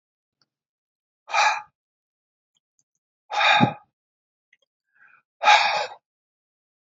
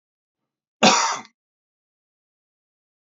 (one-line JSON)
{"exhalation_length": "7.0 s", "exhalation_amplitude": 24935, "exhalation_signal_mean_std_ratio": 0.3, "cough_length": "3.1 s", "cough_amplitude": 28920, "cough_signal_mean_std_ratio": 0.25, "survey_phase": "beta (2021-08-13 to 2022-03-07)", "age": "65+", "gender": "Male", "wearing_mask": "No", "symptom_none": true, "smoker_status": "Never smoked", "respiratory_condition_asthma": false, "respiratory_condition_other": false, "recruitment_source": "REACT", "submission_delay": "3 days", "covid_test_result": "Negative", "covid_test_method": "RT-qPCR", "influenza_a_test_result": "Negative", "influenza_b_test_result": "Negative"}